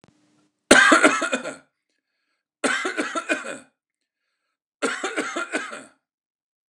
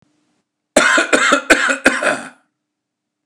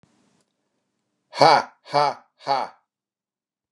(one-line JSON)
{"three_cough_length": "6.7 s", "three_cough_amplitude": 29204, "three_cough_signal_mean_std_ratio": 0.37, "cough_length": "3.3 s", "cough_amplitude": 29204, "cough_signal_mean_std_ratio": 0.49, "exhalation_length": "3.7 s", "exhalation_amplitude": 29204, "exhalation_signal_mean_std_ratio": 0.29, "survey_phase": "beta (2021-08-13 to 2022-03-07)", "age": "45-64", "gender": "Male", "wearing_mask": "No", "symptom_none": true, "smoker_status": "Never smoked", "respiratory_condition_asthma": false, "respiratory_condition_other": false, "recruitment_source": "REACT", "submission_delay": "0 days", "covid_test_result": "Negative", "covid_test_method": "RT-qPCR", "influenza_a_test_result": "Negative", "influenza_b_test_result": "Negative"}